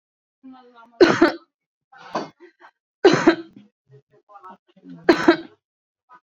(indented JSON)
{
  "cough_length": "6.3 s",
  "cough_amplitude": 32767,
  "cough_signal_mean_std_ratio": 0.29,
  "survey_phase": "beta (2021-08-13 to 2022-03-07)",
  "age": "45-64",
  "gender": "Female",
  "wearing_mask": "No",
  "symptom_none": true,
  "smoker_status": "Current smoker (1 to 10 cigarettes per day)",
  "respiratory_condition_asthma": false,
  "respiratory_condition_other": false,
  "recruitment_source": "REACT",
  "submission_delay": "1 day",
  "covid_test_result": "Negative",
  "covid_test_method": "RT-qPCR"
}